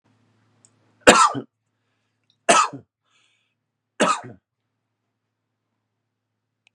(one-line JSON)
{"three_cough_length": "6.7 s", "three_cough_amplitude": 32768, "three_cough_signal_mean_std_ratio": 0.23, "survey_phase": "beta (2021-08-13 to 2022-03-07)", "age": "18-44", "gender": "Male", "wearing_mask": "No", "symptom_abdominal_pain": true, "symptom_fatigue": true, "symptom_onset": "12 days", "smoker_status": "Never smoked", "respiratory_condition_asthma": false, "respiratory_condition_other": false, "recruitment_source": "REACT", "submission_delay": "2 days", "covid_test_result": "Negative", "covid_test_method": "RT-qPCR"}